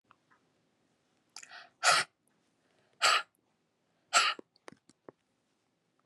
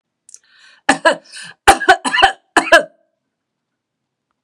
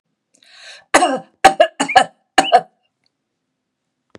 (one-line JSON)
{"exhalation_length": "6.1 s", "exhalation_amplitude": 8437, "exhalation_signal_mean_std_ratio": 0.26, "three_cough_length": "4.4 s", "three_cough_amplitude": 32768, "three_cough_signal_mean_std_ratio": 0.33, "cough_length": "4.2 s", "cough_amplitude": 32768, "cough_signal_mean_std_ratio": 0.32, "survey_phase": "beta (2021-08-13 to 2022-03-07)", "age": "65+", "gender": "Female", "wearing_mask": "No", "symptom_none": true, "smoker_status": "Never smoked", "respiratory_condition_asthma": false, "respiratory_condition_other": false, "recruitment_source": "REACT", "submission_delay": "1 day", "covid_test_result": "Negative", "covid_test_method": "RT-qPCR", "influenza_a_test_result": "Negative", "influenza_b_test_result": "Negative"}